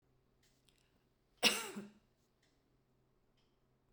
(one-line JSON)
{"cough_length": "3.9 s", "cough_amplitude": 5350, "cough_signal_mean_std_ratio": 0.2, "survey_phase": "beta (2021-08-13 to 2022-03-07)", "age": "65+", "gender": "Female", "wearing_mask": "No", "symptom_none": true, "smoker_status": "Ex-smoker", "respiratory_condition_asthma": false, "respiratory_condition_other": false, "recruitment_source": "REACT", "submission_delay": "2 days", "covid_test_result": "Negative", "covid_test_method": "RT-qPCR"}